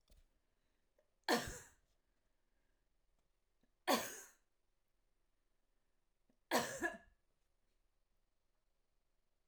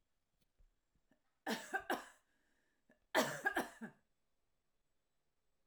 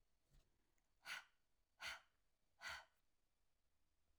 {
  "three_cough_length": "9.5 s",
  "three_cough_amplitude": 2997,
  "three_cough_signal_mean_std_ratio": 0.24,
  "cough_length": "5.7 s",
  "cough_amplitude": 3222,
  "cough_signal_mean_std_ratio": 0.3,
  "exhalation_length": "4.2 s",
  "exhalation_amplitude": 355,
  "exhalation_signal_mean_std_ratio": 0.36,
  "survey_phase": "alpha (2021-03-01 to 2021-08-12)",
  "age": "45-64",
  "gender": "Female",
  "wearing_mask": "No",
  "symptom_none": true,
  "symptom_onset": "3 days",
  "smoker_status": "Never smoked",
  "respiratory_condition_asthma": false,
  "respiratory_condition_other": false,
  "recruitment_source": "REACT",
  "submission_delay": "2 days",
  "covid_test_result": "Negative",
  "covid_test_method": "RT-qPCR"
}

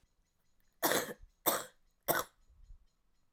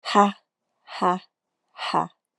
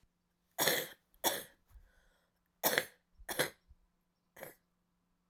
{
  "three_cough_length": "3.3 s",
  "three_cough_amplitude": 8592,
  "three_cough_signal_mean_std_ratio": 0.34,
  "exhalation_length": "2.4 s",
  "exhalation_amplitude": 25909,
  "exhalation_signal_mean_std_ratio": 0.36,
  "cough_length": "5.3 s",
  "cough_amplitude": 9667,
  "cough_signal_mean_std_ratio": 0.31,
  "survey_phase": "alpha (2021-03-01 to 2021-08-12)",
  "age": "18-44",
  "gender": "Female",
  "wearing_mask": "No",
  "symptom_cough_any": true,
  "symptom_diarrhoea": true,
  "symptom_fatigue": true,
  "symptom_onset": "2 days",
  "smoker_status": "Never smoked",
  "respiratory_condition_asthma": false,
  "respiratory_condition_other": false,
  "recruitment_source": "Test and Trace",
  "submission_delay": "1 day",
  "covid_test_result": "Positive",
  "covid_test_method": "ePCR"
}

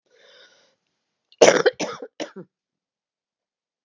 {
  "cough_length": "3.8 s",
  "cough_amplitude": 32768,
  "cough_signal_mean_std_ratio": 0.22,
  "survey_phase": "beta (2021-08-13 to 2022-03-07)",
  "age": "65+",
  "gender": "Female",
  "wearing_mask": "No",
  "symptom_cough_any": true,
  "symptom_new_continuous_cough": true,
  "symptom_runny_or_blocked_nose": true,
  "symptom_sore_throat": true,
  "symptom_change_to_sense_of_smell_or_taste": true,
  "symptom_loss_of_taste": true,
  "symptom_onset": "3 days",
  "smoker_status": "Never smoked",
  "respiratory_condition_asthma": false,
  "respiratory_condition_other": false,
  "recruitment_source": "Test and Trace",
  "submission_delay": "1 day",
  "covid_test_result": "Negative",
  "covid_test_method": "ePCR"
}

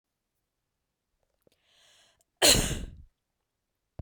{
  "cough_length": "4.0 s",
  "cough_amplitude": 18599,
  "cough_signal_mean_std_ratio": 0.23,
  "survey_phase": "beta (2021-08-13 to 2022-03-07)",
  "age": "18-44",
  "gender": "Female",
  "wearing_mask": "No",
  "symptom_none": true,
  "smoker_status": "Never smoked",
  "respiratory_condition_asthma": false,
  "respiratory_condition_other": false,
  "recruitment_source": "REACT",
  "submission_delay": "1 day",
  "covid_test_result": "Negative",
  "covid_test_method": "RT-qPCR"
}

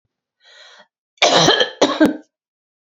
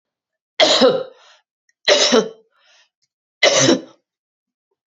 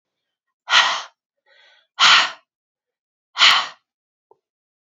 {
  "cough_length": "2.8 s",
  "cough_amplitude": 32768,
  "cough_signal_mean_std_ratio": 0.42,
  "three_cough_length": "4.9 s",
  "three_cough_amplitude": 32767,
  "three_cough_signal_mean_std_ratio": 0.4,
  "exhalation_length": "4.9 s",
  "exhalation_amplitude": 32767,
  "exhalation_signal_mean_std_ratio": 0.32,
  "survey_phase": "beta (2021-08-13 to 2022-03-07)",
  "age": "65+",
  "gender": "Female",
  "wearing_mask": "No",
  "symptom_cough_any": true,
  "symptom_runny_or_blocked_nose": true,
  "symptom_onset": "4 days",
  "smoker_status": "Never smoked",
  "respiratory_condition_asthma": false,
  "respiratory_condition_other": true,
  "recruitment_source": "REACT",
  "submission_delay": "2 days",
  "covid_test_result": "Negative",
  "covid_test_method": "RT-qPCR",
  "influenza_a_test_result": "Negative",
  "influenza_b_test_result": "Negative"
}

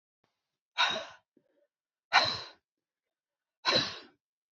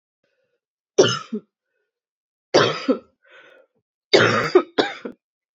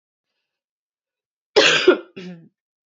{
  "exhalation_length": "4.5 s",
  "exhalation_amplitude": 12880,
  "exhalation_signal_mean_std_ratio": 0.31,
  "three_cough_length": "5.5 s",
  "three_cough_amplitude": 30975,
  "three_cough_signal_mean_std_ratio": 0.34,
  "cough_length": "2.9 s",
  "cough_amplitude": 29417,
  "cough_signal_mean_std_ratio": 0.3,
  "survey_phase": "beta (2021-08-13 to 2022-03-07)",
  "age": "18-44",
  "gender": "Female",
  "wearing_mask": "No",
  "symptom_cough_any": true,
  "symptom_runny_or_blocked_nose": true,
  "symptom_sore_throat": true,
  "symptom_headache": true,
  "symptom_onset": "2 days",
  "smoker_status": "Never smoked",
  "respiratory_condition_asthma": false,
  "respiratory_condition_other": false,
  "recruitment_source": "Test and Trace",
  "submission_delay": "1 day",
  "covid_test_result": "Positive",
  "covid_test_method": "RT-qPCR",
  "covid_ct_value": 24.3,
  "covid_ct_gene": "ORF1ab gene"
}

